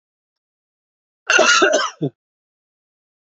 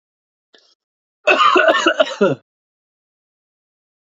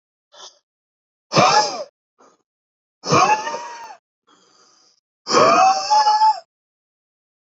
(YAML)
cough_length: 3.2 s
cough_amplitude: 32767
cough_signal_mean_std_ratio: 0.36
three_cough_length: 4.1 s
three_cough_amplitude: 28955
three_cough_signal_mean_std_ratio: 0.38
exhalation_length: 7.6 s
exhalation_amplitude: 26710
exhalation_signal_mean_std_ratio: 0.43
survey_phase: beta (2021-08-13 to 2022-03-07)
age: 18-44
gender: Male
wearing_mask: 'No'
symptom_cough_any: true
symptom_runny_or_blocked_nose: true
symptom_shortness_of_breath: true
symptom_sore_throat: true
symptom_diarrhoea: true
symptom_onset: 4 days
smoker_status: Never smoked
respiratory_condition_asthma: true
respiratory_condition_other: false
recruitment_source: Test and Trace
submission_delay: 1 day
covid_test_result: Positive
covid_test_method: ePCR